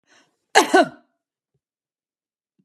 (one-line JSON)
{"cough_length": "2.6 s", "cough_amplitude": 32767, "cough_signal_mean_std_ratio": 0.24, "survey_phase": "beta (2021-08-13 to 2022-03-07)", "age": "45-64", "gender": "Female", "wearing_mask": "No", "symptom_runny_or_blocked_nose": true, "smoker_status": "Ex-smoker", "respiratory_condition_asthma": false, "respiratory_condition_other": false, "recruitment_source": "REACT", "submission_delay": "0 days", "covid_test_result": "Negative", "covid_test_method": "RT-qPCR"}